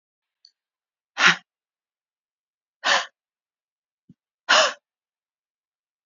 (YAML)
exhalation_length: 6.1 s
exhalation_amplitude: 26447
exhalation_signal_mean_std_ratio: 0.23
survey_phase: beta (2021-08-13 to 2022-03-07)
age: 45-64
gender: Female
wearing_mask: 'No'
symptom_runny_or_blocked_nose: true
smoker_status: Never smoked
respiratory_condition_asthma: false
respiratory_condition_other: false
recruitment_source: REACT
submission_delay: 2 days
covid_test_result: Negative
covid_test_method: RT-qPCR